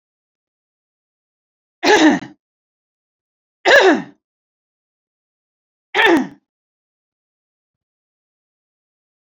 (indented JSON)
{
  "three_cough_length": "9.2 s",
  "three_cough_amplitude": 29392,
  "three_cough_signal_mean_std_ratio": 0.27,
  "survey_phase": "beta (2021-08-13 to 2022-03-07)",
  "age": "45-64",
  "gender": "Female",
  "wearing_mask": "No",
  "symptom_sore_throat": true,
  "smoker_status": "Never smoked",
  "respiratory_condition_asthma": false,
  "respiratory_condition_other": false,
  "recruitment_source": "REACT",
  "submission_delay": "1 day",
  "covid_test_result": "Negative",
  "covid_test_method": "RT-qPCR"
}